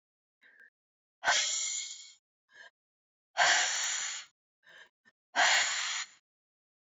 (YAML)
exhalation_length: 6.9 s
exhalation_amplitude: 8543
exhalation_signal_mean_std_ratio: 0.44
survey_phase: beta (2021-08-13 to 2022-03-07)
age: 45-64
gender: Female
wearing_mask: 'No'
symptom_cough_any: true
symptom_new_continuous_cough: true
symptom_shortness_of_breath: true
symptom_diarrhoea: true
symptom_fatigue: true
symptom_headache: true
symptom_change_to_sense_of_smell_or_taste: true
symptom_onset: 5 days
smoker_status: Never smoked
respiratory_condition_asthma: false
respiratory_condition_other: true
recruitment_source: Test and Trace
submission_delay: 1 day
covid_test_result: Positive
covid_test_method: RT-qPCR
covid_ct_value: 35.9
covid_ct_gene: N gene
covid_ct_mean: 36.4
covid_viral_load: 1.1 copies/ml
covid_viral_load_category: Minimal viral load (< 10K copies/ml)